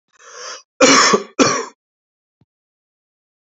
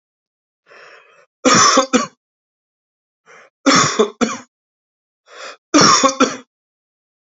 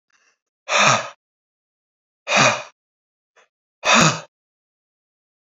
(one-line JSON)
{"cough_length": "3.5 s", "cough_amplitude": 32768, "cough_signal_mean_std_ratio": 0.36, "three_cough_length": "7.3 s", "three_cough_amplitude": 32768, "three_cough_signal_mean_std_ratio": 0.38, "exhalation_length": "5.5 s", "exhalation_amplitude": 31290, "exhalation_signal_mean_std_ratio": 0.33, "survey_phase": "beta (2021-08-13 to 2022-03-07)", "age": "45-64", "gender": "Male", "wearing_mask": "No", "symptom_none": true, "smoker_status": "Never smoked", "respiratory_condition_asthma": false, "respiratory_condition_other": false, "recruitment_source": "REACT", "submission_delay": "1 day", "covid_test_result": "Negative", "covid_test_method": "RT-qPCR"}